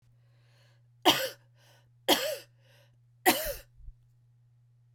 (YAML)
three_cough_length: 4.9 s
three_cough_amplitude: 14510
three_cough_signal_mean_std_ratio: 0.3
survey_phase: beta (2021-08-13 to 2022-03-07)
age: 45-64
gender: Female
wearing_mask: 'No'
symptom_cough_any: true
symptom_runny_or_blocked_nose: true
symptom_onset: 4 days
smoker_status: Never smoked
respiratory_condition_asthma: false
respiratory_condition_other: false
recruitment_source: Test and Trace
submission_delay: 3 days
covid_test_result: Positive
covid_test_method: RT-qPCR
covid_ct_value: 14.8
covid_ct_gene: N gene
covid_ct_mean: 15.1
covid_viral_load: 11000000 copies/ml
covid_viral_load_category: High viral load (>1M copies/ml)